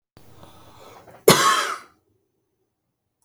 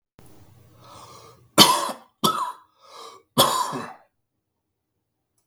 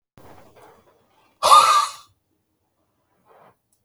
cough_length: 3.2 s
cough_amplitude: 32768
cough_signal_mean_std_ratio: 0.29
three_cough_length: 5.5 s
three_cough_amplitude: 32768
three_cough_signal_mean_std_ratio: 0.31
exhalation_length: 3.8 s
exhalation_amplitude: 32766
exhalation_signal_mean_std_ratio: 0.28
survey_phase: beta (2021-08-13 to 2022-03-07)
age: 65+
gender: Male
wearing_mask: 'No'
symptom_cough_any: true
symptom_runny_or_blocked_nose: true
symptom_sore_throat: true
smoker_status: Ex-smoker
respiratory_condition_asthma: false
respiratory_condition_other: false
recruitment_source: REACT
submission_delay: 3 days
covid_test_result: Negative
covid_test_method: RT-qPCR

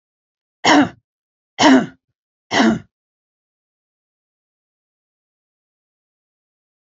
three_cough_length: 6.8 s
three_cough_amplitude: 30257
three_cough_signal_mean_std_ratio: 0.26
survey_phase: alpha (2021-03-01 to 2021-08-12)
age: 65+
gender: Female
wearing_mask: 'No'
symptom_none: true
smoker_status: Never smoked
respiratory_condition_asthma: false
respiratory_condition_other: false
recruitment_source: REACT
submission_delay: 2 days
covid_test_result: Negative
covid_test_method: RT-qPCR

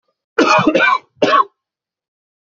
cough_length: 2.5 s
cough_amplitude: 29155
cough_signal_mean_std_ratio: 0.49
survey_phase: beta (2021-08-13 to 2022-03-07)
age: 18-44
gender: Male
wearing_mask: 'No'
symptom_none: true
symptom_onset: 3 days
smoker_status: Never smoked
respiratory_condition_asthma: false
respiratory_condition_other: false
recruitment_source: Test and Trace
submission_delay: 2 days
covid_test_result: Positive
covid_test_method: RT-qPCR
covid_ct_value: 23.6
covid_ct_gene: ORF1ab gene
covid_ct_mean: 23.9
covid_viral_load: 14000 copies/ml
covid_viral_load_category: Low viral load (10K-1M copies/ml)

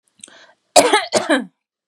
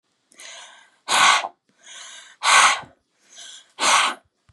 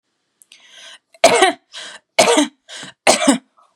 cough_length: 1.9 s
cough_amplitude: 32768
cough_signal_mean_std_ratio: 0.4
exhalation_length: 4.5 s
exhalation_amplitude: 29595
exhalation_signal_mean_std_ratio: 0.41
three_cough_length: 3.8 s
three_cough_amplitude: 32768
three_cough_signal_mean_std_ratio: 0.4
survey_phase: beta (2021-08-13 to 2022-03-07)
age: 18-44
gender: Female
wearing_mask: 'No'
symptom_none: true
smoker_status: Never smoked
respiratory_condition_asthma: false
respiratory_condition_other: false
recruitment_source: REACT
submission_delay: 2 days
covid_test_result: Negative
covid_test_method: RT-qPCR
influenza_a_test_result: Negative
influenza_b_test_result: Negative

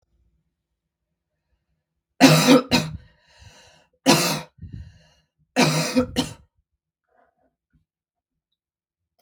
three_cough_length: 9.2 s
three_cough_amplitude: 32768
three_cough_signal_mean_std_ratio: 0.3
survey_phase: beta (2021-08-13 to 2022-03-07)
age: 18-44
gender: Female
wearing_mask: 'No'
symptom_cough_any: true
symptom_runny_or_blocked_nose: true
symptom_sore_throat: true
symptom_diarrhoea: true
symptom_fatigue: true
symptom_headache: true
symptom_onset: 1 day
smoker_status: Ex-smoker
respiratory_condition_asthma: false
respiratory_condition_other: false
recruitment_source: Test and Trace
submission_delay: 1 day
covid_test_result: Positive
covid_test_method: RT-qPCR
covid_ct_value: 21.4
covid_ct_gene: N gene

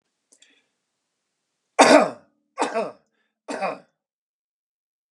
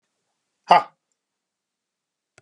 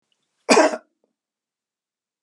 three_cough_length: 5.1 s
three_cough_amplitude: 31707
three_cough_signal_mean_std_ratio: 0.25
exhalation_length: 2.4 s
exhalation_amplitude: 31202
exhalation_signal_mean_std_ratio: 0.16
cough_length: 2.2 s
cough_amplitude: 29992
cough_signal_mean_std_ratio: 0.26
survey_phase: beta (2021-08-13 to 2022-03-07)
age: 65+
gender: Male
wearing_mask: 'No'
symptom_none: true
smoker_status: Never smoked
respiratory_condition_asthma: false
respiratory_condition_other: false
recruitment_source: REACT
submission_delay: 1 day
covid_test_result: Negative
covid_test_method: RT-qPCR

